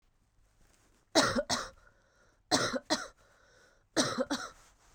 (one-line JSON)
{"three_cough_length": "4.9 s", "three_cough_amplitude": 11089, "three_cough_signal_mean_std_ratio": 0.39, "survey_phase": "beta (2021-08-13 to 2022-03-07)", "age": "18-44", "gender": "Female", "wearing_mask": "No", "symptom_cough_any": true, "symptom_new_continuous_cough": true, "symptom_runny_or_blocked_nose": true, "symptom_sore_throat": true, "symptom_headache": true, "smoker_status": "Ex-smoker", "respiratory_condition_asthma": false, "respiratory_condition_other": false, "recruitment_source": "Test and Trace", "submission_delay": "1 day", "covid_test_result": "Positive", "covid_test_method": "LFT"}